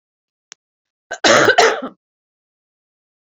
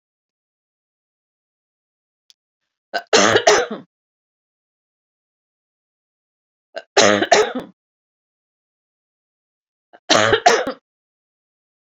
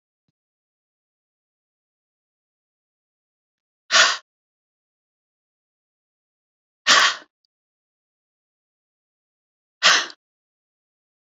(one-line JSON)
{"cough_length": "3.3 s", "cough_amplitude": 30521, "cough_signal_mean_std_ratio": 0.32, "three_cough_length": "11.9 s", "three_cough_amplitude": 32521, "three_cough_signal_mean_std_ratio": 0.28, "exhalation_length": "11.3 s", "exhalation_amplitude": 28413, "exhalation_signal_mean_std_ratio": 0.19, "survey_phase": "beta (2021-08-13 to 2022-03-07)", "age": "45-64", "gender": "Female", "wearing_mask": "No", "symptom_cough_any": true, "symptom_runny_or_blocked_nose": true, "symptom_diarrhoea": true, "symptom_fatigue": true, "symptom_headache": true, "smoker_status": "Ex-smoker", "respiratory_condition_asthma": false, "respiratory_condition_other": false, "recruitment_source": "Test and Trace", "submission_delay": "1 day", "covid_test_result": "Positive", "covid_test_method": "RT-qPCR", "covid_ct_value": 15.6, "covid_ct_gene": "ORF1ab gene", "covid_ct_mean": 15.6, "covid_viral_load": "7500000 copies/ml", "covid_viral_load_category": "High viral load (>1M copies/ml)"}